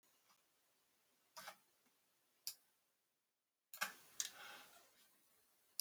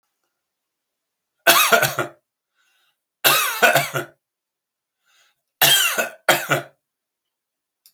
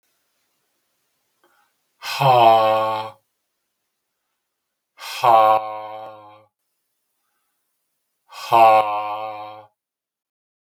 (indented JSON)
{
  "cough_length": "5.8 s",
  "cough_amplitude": 2399,
  "cough_signal_mean_std_ratio": 0.27,
  "three_cough_length": "7.9 s",
  "three_cough_amplitude": 32237,
  "three_cough_signal_mean_std_ratio": 0.37,
  "exhalation_length": "10.7 s",
  "exhalation_amplitude": 32174,
  "exhalation_signal_mean_std_ratio": 0.36,
  "survey_phase": "beta (2021-08-13 to 2022-03-07)",
  "age": "65+",
  "gender": "Male",
  "wearing_mask": "No",
  "symptom_none": true,
  "smoker_status": "Never smoked",
  "respiratory_condition_asthma": false,
  "respiratory_condition_other": false,
  "recruitment_source": "REACT",
  "submission_delay": "2 days",
  "covid_test_result": "Negative",
  "covid_test_method": "RT-qPCR"
}